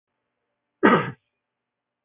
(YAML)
cough_length: 2.0 s
cough_amplitude: 21743
cough_signal_mean_std_ratio: 0.25
survey_phase: beta (2021-08-13 to 2022-03-07)
age: 65+
gender: Male
wearing_mask: 'No'
symptom_none: true
smoker_status: Never smoked
respiratory_condition_asthma: false
respiratory_condition_other: false
recruitment_source: REACT
submission_delay: 1 day
covid_test_result: Negative
covid_test_method: RT-qPCR
influenza_a_test_result: Negative
influenza_b_test_result: Negative